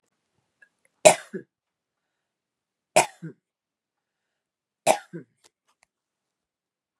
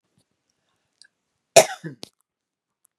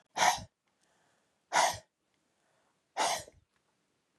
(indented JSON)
{
  "three_cough_length": "7.0 s",
  "three_cough_amplitude": 32767,
  "three_cough_signal_mean_std_ratio": 0.15,
  "cough_length": "3.0 s",
  "cough_amplitude": 32768,
  "cough_signal_mean_std_ratio": 0.14,
  "exhalation_length": "4.2 s",
  "exhalation_amplitude": 7158,
  "exhalation_signal_mean_std_ratio": 0.31,
  "survey_phase": "beta (2021-08-13 to 2022-03-07)",
  "age": "65+",
  "gender": "Female",
  "wearing_mask": "No",
  "symptom_none": true,
  "smoker_status": "Ex-smoker",
  "respiratory_condition_asthma": false,
  "respiratory_condition_other": false,
  "recruitment_source": "REACT",
  "submission_delay": "1 day",
  "covid_test_result": "Negative",
  "covid_test_method": "RT-qPCR",
  "influenza_a_test_result": "Negative",
  "influenza_b_test_result": "Negative"
}